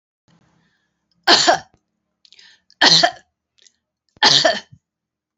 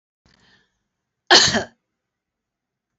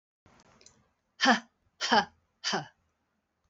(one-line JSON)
{"three_cough_length": "5.4 s", "three_cough_amplitude": 30090, "three_cough_signal_mean_std_ratio": 0.33, "cough_length": "3.0 s", "cough_amplitude": 32768, "cough_signal_mean_std_ratio": 0.24, "exhalation_length": "3.5 s", "exhalation_amplitude": 12013, "exhalation_signal_mean_std_ratio": 0.3, "survey_phase": "beta (2021-08-13 to 2022-03-07)", "age": "65+", "gender": "Female", "wearing_mask": "No", "symptom_fatigue": true, "symptom_headache": true, "smoker_status": "Never smoked", "respiratory_condition_asthma": false, "respiratory_condition_other": false, "recruitment_source": "REACT", "submission_delay": "3 days", "covid_test_result": "Negative", "covid_test_method": "RT-qPCR"}